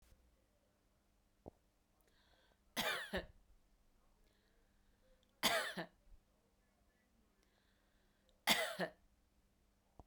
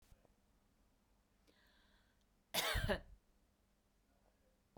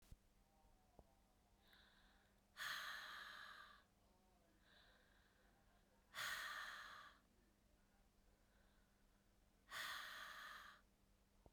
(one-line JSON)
{"three_cough_length": "10.1 s", "three_cough_amplitude": 4074, "three_cough_signal_mean_std_ratio": 0.28, "cough_length": "4.8 s", "cough_amplitude": 1912, "cough_signal_mean_std_ratio": 0.28, "exhalation_length": "11.5 s", "exhalation_amplitude": 487, "exhalation_signal_mean_std_ratio": 0.51, "survey_phase": "beta (2021-08-13 to 2022-03-07)", "age": "45-64", "gender": "Female", "wearing_mask": "No", "symptom_none": true, "smoker_status": "Ex-smoker", "respiratory_condition_asthma": false, "respiratory_condition_other": false, "recruitment_source": "REACT", "submission_delay": "1 day", "covid_test_result": "Negative", "covid_test_method": "RT-qPCR", "influenza_a_test_result": "Negative", "influenza_b_test_result": "Negative"}